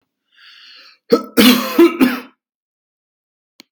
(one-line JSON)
{"cough_length": "3.7 s", "cough_amplitude": 32768, "cough_signal_mean_std_ratio": 0.36, "survey_phase": "beta (2021-08-13 to 2022-03-07)", "age": "45-64", "gender": "Male", "wearing_mask": "No", "symptom_none": true, "smoker_status": "Never smoked", "respiratory_condition_asthma": false, "respiratory_condition_other": false, "recruitment_source": "REACT", "submission_delay": "16 days", "covid_test_result": "Negative", "covid_test_method": "RT-qPCR"}